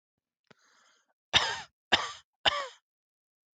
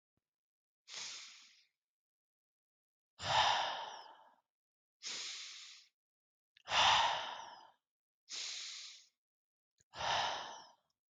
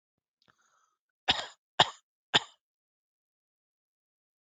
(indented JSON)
{
  "three_cough_length": "3.6 s",
  "three_cough_amplitude": 12432,
  "three_cough_signal_mean_std_ratio": 0.28,
  "exhalation_length": "11.1 s",
  "exhalation_amplitude": 4071,
  "exhalation_signal_mean_std_ratio": 0.38,
  "cough_length": "4.4 s",
  "cough_amplitude": 16837,
  "cough_signal_mean_std_ratio": 0.16,
  "survey_phase": "beta (2021-08-13 to 2022-03-07)",
  "age": "18-44",
  "gender": "Male",
  "wearing_mask": "No",
  "symptom_none": true,
  "smoker_status": "Never smoked",
  "respiratory_condition_asthma": true,
  "respiratory_condition_other": false,
  "recruitment_source": "REACT",
  "submission_delay": "6 days",
  "covid_test_result": "Negative",
  "covid_test_method": "RT-qPCR",
  "influenza_a_test_result": "Negative",
  "influenza_b_test_result": "Negative"
}